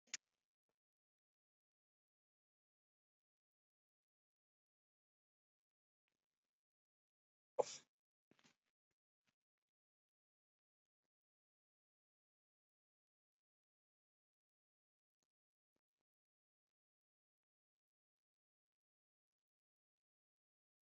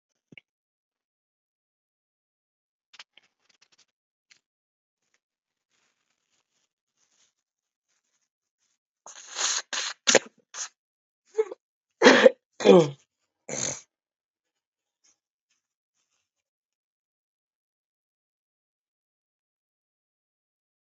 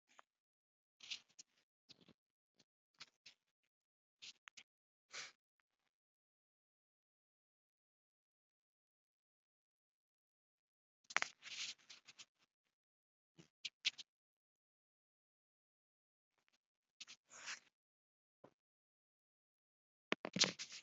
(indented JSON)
{
  "exhalation_length": "20.8 s",
  "exhalation_amplitude": 2394,
  "exhalation_signal_mean_std_ratio": 0.05,
  "cough_length": "20.8 s",
  "cough_amplitude": 28766,
  "cough_signal_mean_std_ratio": 0.16,
  "three_cough_length": "20.8 s",
  "three_cough_amplitude": 7583,
  "three_cough_signal_mean_std_ratio": 0.14,
  "survey_phase": "alpha (2021-03-01 to 2021-08-12)",
  "age": "45-64",
  "gender": "Male",
  "wearing_mask": "No",
  "symptom_fatigue": true,
  "symptom_onset": "4 days",
  "smoker_status": "Never smoked",
  "respiratory_condition_asthma": true,
  "respiratory_condition_other": false,
  "recruitment_source": "Test and Trace",
  "submission_delay": "2 days",
  "covid_test_result": "Positive",
  "covid_test_method": "RT-qPCR",
  "covid_ct_value": 15.7,
  "covid_ct_gene": "ORF1ab gene",
  "covid_ct_mean": 16.1,
  "covid_viral_load": "5300000 copies/ml",
  "covid_viral_load_category": "High viral load (>1M copies/ml)"
}